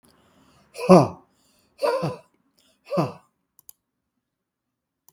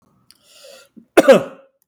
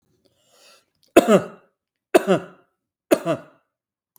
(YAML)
exhalation_length: 5.1 s
exhalation_amplitude: 32768
exhalation_signal_mean_std_ratio: 0.25
cough_length: 1.9 s
cough_amplitude: 32768
cough_signal_mean_std_ratio: 0.28
three_cough_length: 4.2 s
three_cough_amplitude: 32768
three_cough_signal_mean_std_ratio: 0.27
survey_phase: beta (2021-08-13 to 2022-03-07)
age: 45-64
gender: Male
wearing_mask: 'No'
symptom_none: true
symptom_onset: 12 days
smoker_status: Never smoked
respiratory_condition_asthma: true
respiratory_condition_other: false
recruitment_source: REACT
submission_delay: 2 days
covid_test_result: Negative
covid_test_method: RT-qPCR
influenza_a_test_result: Negative
influenza_b_test_result: Negative